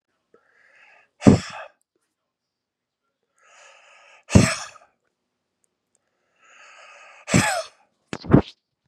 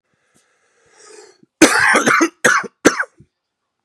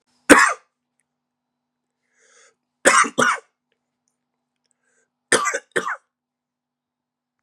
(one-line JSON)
{"exhalation_length": "8.9 s", "exhalation_amplitude": 32768, "exhalation_signal_mean_std_ratio": 0.22, "cough_length": "3.8 s", "cough_amplitude": 32768, "cough_signal_mean_std_ratio": 0.4, "three_cough_length": "7.4 s", "three_cough_amplitude": 32768, "three_cough_signal_mean_std_ratio": 0.26, "survey_phase": "beta (2021-08-13 to 2022-03-07)", "age": "45-64", "gender": "Male", "wearing_mask": "No", "symptom_cough_any": true, "symptom_runny_or_blocked_nose": true, "smoker_status": "Ex-smoker", "respiratory_condition_asthma": false, "respiratory_condition_other": false, "recruitment_source": "Test and Trace", "submission_delay": "2 days", "covid_test_result": "Positive", "covid_test_method": "LFT"}